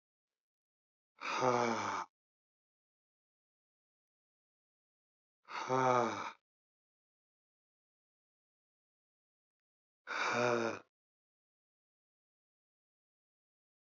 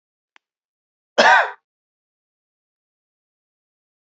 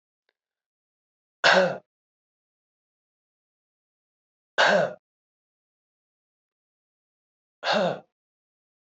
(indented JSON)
{
  "exhalation_length": "14.0 s",
  "exhalation_amplitude": 4726,
  "exhalation_signal_mean_std_ratio": 0.29,
  "cough_length": "4.0 s",
  "cough_amplitude": 28063,
  "cough_signal_mean_std_ratio": 0.21,
  "three_cough_length": "9.0 s",
  "three_cough_amplitude": 20516,
  "three_cough_signal_mean_std_ratio": 0.25,
  "survey_phase": "beta (2021-08-13 to 2022-03-07)",
  "age": "45-64",
  "gender": "Male",
  "wearing_mask": "No",
  "symptom_runny_or_blocked_nose": true,
  "symptom_change_to_sense_of_smell_or_taste": true,
  "smoker_status": "Never smoked",
  "respiratory_condition_asthma": false,
  "respiratory_condition_other": false,
  "recruitment_source": "Test and Trace",
  "submission_delay": "2 days",
  "covid_test_result": "Positive",
  "covid_test_method": "RT-qPCR",
  "covid_ct_value": 17.2,
  "covid_ct_gene": "ORF1ab gene",
  "covid_ct_mean": 18.2,
  "covid_viral_load": "1100000 copies/ml",
  "covid_viral_load_category": "High viral load (>1M copies/ml)"
}